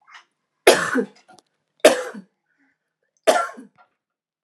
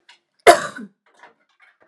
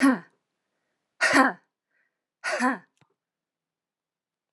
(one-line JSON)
{"three_cough_length": "4.4 s", "three_cough_amplitude": 32767, "three_cough_signal_mean_std_ratio": 0.29, "cough_length": "1.9 s", "cough_amplitude": 32768, "cough_signal_mean_std_ratio": 0.21, "exhalation_length": "4.5 s", "exhalation_amplitude": 22794, "exhalation_signal_mean_std_ratio": 0.3, "survey_phase": "alpha (2021-03-01 to 2021-08-12)", "age": "18-44", "gender": "Female", "wearing_mask": "No", "symptom_none": true, "smoker_status": "Ex-smoker", "respiratory_condition_asthma": false, "respiratory_condition_other": false, "recruitment_source": "REACT", "submission_delay": "1 day", "covid_test_result": "Negative", "covid_test_method": "RT-qPCR"}